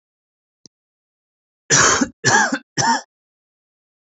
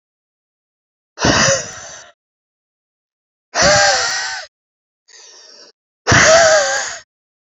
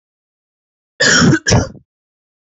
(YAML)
three_cough_length: 4.2 s
three_cough_amplitude: 28484
three_cough_signal_mean_std_ratio: 0.37
exhalation_length: 7.5 s
exhalation_amplitude: 32225
exhalation_signal_mean_std_ratio: 0.44
cough_length: 2.6 s
cough_amplitude: 32733
cough_signal_mean_std_ratio: 0.41
survey_phase: beta (2021-08-13 to 2022-03-07)
age: 18-44
gender: Male
wearing_mask: 'No'
symptom_none: true
smoker_status: Never smoked
respiratory_condition_asthma: false
respiratory_condition_other: false
recruitment_source: REACT
submission_delay: 1 day
covid_test_result: Negative
covid_test_method: RT-qPCR